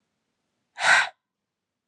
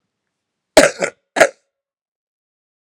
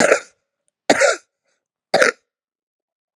{"exhalation_length": "1.9 s", "exhalation_amplitude": 17661, "exhalation_signal_mean_std_ratio": 0.29, "cough_length": "2.8 s", "cough_amplitude": 32768, "cough_signal_mean_std_ratio": 0.24, "three_cough_length": "3.2 s", "three_cough_amplitude": 32768, "three_cough_signal_mean_std_ratio": 0.33, "survey_phase": "alpha (2021-03-01 to 2021-08-12)", "age": "18-44", "gender": "Female", "wearing_mask": "No", "symptom_cough_any": true, "symptom_fatigue": true, "symptom_fever_high_temperature": true, "symptom_headache": true, "symptom_change_to_sense_of_smell_or_taste": true, "symptom_onset": "3 days", "smoker_status": "Never smoked", "respiratory_condition_asthma": false, "respiratory_condition_other": false, "recruitment_source": "Test and Trace", "submission_delay": "2 days", "covid_test_result": "Positive", "covid_test_method": "RT-qPCR", "covid_ct_value": 14.6, "covid_ct_gene": "ORF1ab gene", "covid_ct_mean": 15.1, "covid_viral_load": "11000000 copies/ml", "covid_viral_load_category": "High viral load (>1M copies/ml)"}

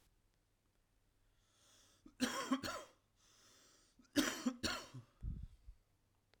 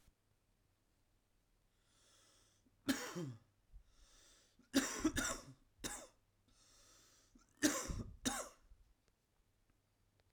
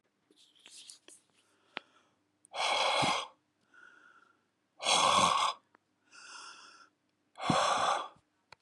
{"cough_length": "6.4 s", "cough_amplitude": 3113, "cough_signal_mean_std_ratio": 0.37, "three_cough_length": "10.3 s", "three_cough_amplitude": 4014, "three_cough_signal_mean_std_ratio": 0.33, "exhalation_length": "8.6 s", "exhalation_amplitude": 6900, "exhalation_signal_mean_std_ratio": 0.42, "survey_phase": "alpha (2021-03-01 to 2021-08-12)", "age": "18-44", "gender": "Male", "wearing_mask": "No", "symptom_cough_any": true, "symptom_headache": true, "symptom_change_to_sense_of_smell_or_taste": true, "symptom_loss_of_taste": true, "symptom_onset": "3 days", "smoker_status": "Ex-smoker", "respiratory_condition_asthma": false, "respiratory_condition_other": false, "recruitment_source": "Test and Trace", "submission_delay": "2 days", "covid_test_result": "Positive", "covid_test_method": "RT-qPCR"}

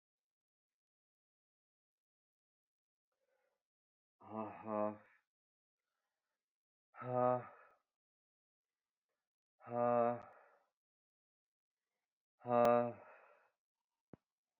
{"exhalation_length": "14.6 s", "exhalation_amplitude": 2989, "exhalation_signal_mean_std_ratio": 0.25, "survey_phase": "beta (2021-08-13 to 2022-03-07)", "age": "45-64", "gender": "Male", "wearing_mask": "No", "symptom_cough_any": true, "symptom_new_continuous_cough": true, "symptom_runny_or_blocked_nose": true, "symptom_fatigue": true, "symptom_headache": true, "symptom_change_to_sense_of_smell_or_taste": true, "symptom_onset": "5 days", "smoker_status": "Never smoked", "respiratory_condition_asthma": false, "respiratory_condition_other": false, "recruitment_source": "Test and Trace", "submission_delay": "2 days", "covid_test_result": "Positive", "covid_test_method": "RT-qPCR"}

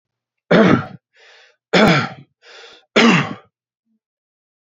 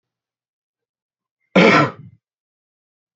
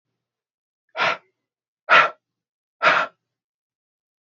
{"three_cough_length": "4.7 s", "three_cough_amplitude": 28712, "three_cough_signal_mean_std_ratio": 0.39, "cough_length": "3.2 s", "cough_amplitude": 28247, "cough_signal_mean_std_ratio": 0.27, "exhalation_length": "4.3 s", "exhalation_amplitude": 27181, "exhalation_signal_mean_std_ratio": 0.28, "survey_phase": "beta (2021-08-13 to 2022-03-07)", "age": "18-44", "gender": "Male", "wearing_mask": "No", "symptom_cough_any": true, "symptom_runny_or_blocked_nose": true, "symptom_onset": "12 days", "smoker_status": "Ex-smoker", "respiratory_condition_asthma": false, "respiratory_condition_other": false, "recruitment_source": "REACT", "submission_delay": "1 day", "covid_test_result": "Negative", "covid_test_method": "RT-qPCR", "influenza_a_test_result": "Negative", "influenza_b_test_result": "Negative"}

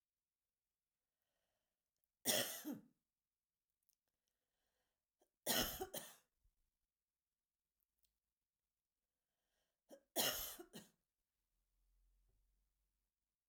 {"three_cough_length": "13.5 s", "three_cough_amplitude": 2273, "three_cough_signal_mean_std_ratio": 0.24, "survey_phase": "alpha (2021-03-01 to 2021-08-12)", "age": "65+", "gender": "Female", "wearing_mask": "No", "symptom_none": true, "smoker_status": "Never smoked", "respiratory_condition_asthma": false, "respiratory_condition_other": false, "recruitment_source": "REACT", "submission_delay": "1 day", "covid_test_result": "Negative", "covid_test_method": "RT-qPCR"}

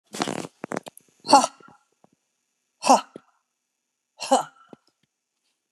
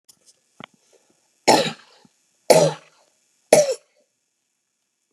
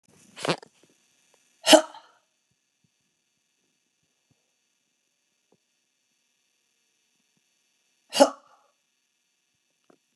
{"exhalation_length": "5.7 s", "exhalation_amplitude": 29333, "exhalation_signal_mean_std_ratio": 0.24, "three_cough_length": "5.1 s", "three_cough_amplitude": 32768, "three_cough_signal_mean_std_ratio": 0.27, "cough_length": "10.2 s", "cough_amplitude": 29965, "cough_signal_mean_std_ratio": 0.14, "survey_phase": "beta (2021-08-13 to 2022-03-07)", "age": "45-64", "gender": "Female", "wearing_mask": "No", "symptom_none": true, "smoker_status": "Never smoked", "respiratory_condition_asthma": false, "respiratory_condition_other": false, "recruitment_source": "REACT", "submission_delay": "1 day", "covid_test_result": "Negative", "covid_test_method": "RT-qPCR"}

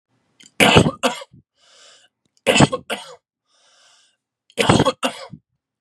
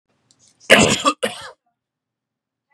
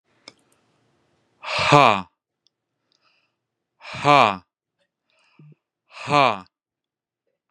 {"three_cough_length": "5.8 s", "three_cough_amplitude": 32768, "three_cough_signal_mean_std_ratio": 0.34, "cough_length": "2.7 s", "cough_amplitude": 32768, "cough_signal_mean_std_ratio": 0.31, "exhalation_length": "7.5 s", "exhalation_amplitude": 32767, "exhalation_signal_mean_std_ratio": 0.25, "survey_phase": "beta (2021-08-13 to 2022-03-07)", "age": "18-44", "gender": "Male", "wearing_mask": "No", "symptom_fatigue": true, "smoker_status": "Never smoked", "respiratory_condition_asthma": false, "respiratory_condition_other": false, "recruitment_source": "REACT", "submission_delay": "2 days", "covid_test_result": "Negative", "covid_test_method": "RT-qPCR", "influenza_a_test_result": "Negative", "influenza_b_test_result": "Negative"}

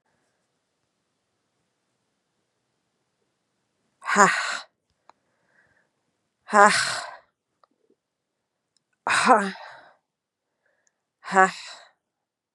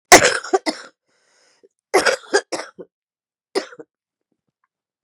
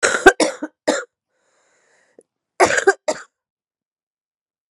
{"exhalation_length": "12.5 s", "exhalation_amplitude": 32328, "exhalation_signal_mean_std_ratio": 0.24, "three_cough_length": "5.0 s", "three_cough_amplitude": 32768, "three_cough_signal_mean_std_ratio": 0.27, "cough_length": "4.7 s", "cough_amplitude": 32768, "cough_signal_mean_std_ratio": 0.29, "survey_phase": "beta (2021-08-13 to 2022-03-07)", "age": "45-64", "gender": "Female", "wearing_mask": "No", "symptom_cough_any": true, "symptom_shortness_of_breath": true, "symptom_fever_high_temperature": true, "symptom_headache": true, "symptom_loss_of_taste": true, "symptom_onset": "4 days", "smoker_status": "Ex-smoker", "respiratory_condition_asthma": false, "respiratory_condition_other": false, "recruitment_source": "Test and Trace", "submission_delay": "1 day", "covid_test_result": "Positive", "covid_test_method": "RT-qPCR"}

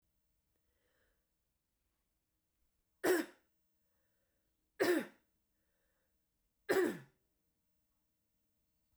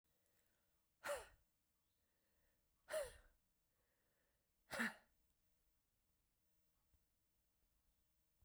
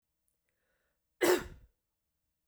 {"three_cough_length": "9.0 s", "three_cough_amplitude": 3340, "three_cough_signal_mean_std_ratio": 0.24, "exhalation_length": "8.4 s", "exhalation_amplitude": 991, "exhalation_signal_mean_std_ratio": 0.25, "cough_length": "2.5 s", "cough_amplitude": 6051, "cough_signal_mean_std_ratio": 0.24, "survey_phase": "beta (2021-08-13 to 2022-03-07)", "age": "45-64", "gender": "Female", "wearing_mask": "No", "symptom_runny_or_blocked_nose": true, "symptom_fatigue": true, "symptom_onset": "10 days", "smoker_status": "Never smoked", "respiratory_condition_asthma": true, "respiratory_condition_other": false, "recruitment_source": "REACT", "submission_delay": "2 days", "covid_test_result": "Negative", "covid_test_method": "RT-qPCR", "influenza_a_test_result": "Negative", "influenza_b_test_result": "Negative"}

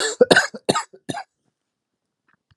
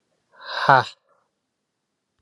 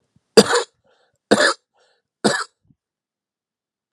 {"cough_length": "2.6 s", "cough_amplitude": 32768, "cough_signal_mean_std_ratio": 0.3, "exhalation_length": "2.2 s", "exhalation_amplitude": 30843, "exhalation_signal_mean_std_ratio": 0.24, "three_cough_length": "3.9 s", "three_cough_amplitude": 32768, "three_cough_signal_mean_std_ratio": 0.27, "survey_phase": "alpha (2021-03-01 to 2021-08-12)", "age": "18-44", "gender": "Male", "wearing_mask": "No", "symptom_cough_any": true, "symptom_fatigue": true, "symptom_fever_high_temperature": true, "symptom_headache": true, "symptom_change_to_sense_of_smell_or_taste": true, "symptom_loss_of_taste": true, "symptom_onset": "3 days", "smoker_status": "Never smoked", "respiratory_condition_asthma": false, "respiratory_condition_other": false, "recruitment_source": "Test and Trace", "submission_delay": "1 day", "covid_test_result": "Positive", "covid_test_method": "RT-qPCR"}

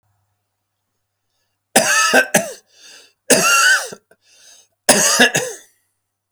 {"three_cough_length": "6.3 s", "three_cough_amplitude": 32768, "three_cough_signal_mean_std_ratio": 0.44, "survey_phase": "beta (2021-08-13 to 2022-03-07)", "age": "45-64", "gender": "Male", "wearing_mask": "No", "symptom_none": true, "smoker_status": "Never smoked", "respiratory_condition_asthma": false, "respiratory_condition_other": false, "recruitment_source": "REACT", "submission_delay": "2 days", "covid_test_result": "Negative", "covid_test_method": "RT-qPCR", "influenza_a_test_result": "Negative", "influenza_b_test_result": "Negative"}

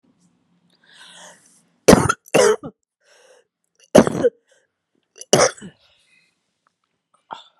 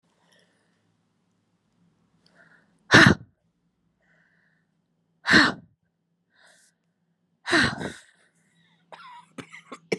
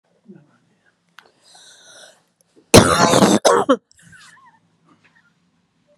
{"three_cough_length": "7.6 s", "three_cough_amplitude": 32768, "three_cough_signal_mean_std_ratio": 0.26, "exhalation_length": "10.0 s", "exhalation_amplitude": 31594, "exhalation_signal_mean_std_ratio": 0.22, "cough_length": "6.0 s", "cough_amplitude": 32768, "cough_signal_mean_std_ratio": 0.3, "survey_phase": "beta (2021-08-13 to 2022-03-07)", "age": "45-64", "gender": "Female", "wearing_mask": "No", "symptom_cough_any": true, "symptom_new_continuous_cough": true, "symptom_runny_or_blocked_nose": true, "symptom_shortness_of_breath": true, "symptom_fatigue": true, "symptom_headache": true, "symptom_change_to_sense_of_smell_or_taste": true, "symptom_onset": "3 days", "smoker_status": "Never smoked", "respiratory_condition_asthma": false, "respiratory_condition_other": false, "recruitment_source": "Test and Trace", "submission_delay": "2 days", "covid_test_result": "Positive", "covid_test_method": "RT-qPCR"}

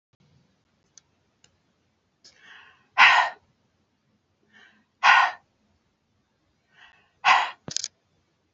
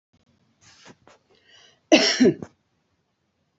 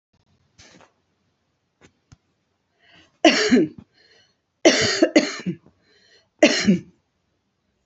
{"exhalation_length": "8.5 s", "exhalation_amplitude": 24401, "exhalation_signal_mean_std_ratio": 0.25, "cough_length": "3.6 s", "cough_amplitude": 27344, "cough_signal_mean_std_ratio": 0.26, "three_cough_length": "7.9 s", "three_cough_amplitude": 29733, "three_cough_signal_mean_std_ratio": 0.32, "survey_phase": "beta (2021-08-13 to 2022-03-07)", "age": "45-64", "gender": "Female", "wearing_mask": "No", "symptom_none": true, "symptom_onset": "4 days", "smoker_status": "Ex-smoker", "respiratory_condition_asthma": false, "respiratory_condition_other": false, "recruitment_source": "Test and Trace", "submission_delay": "2 days", "covid_test_result": "Negative", "covid_test_method": "RT-qPCR"}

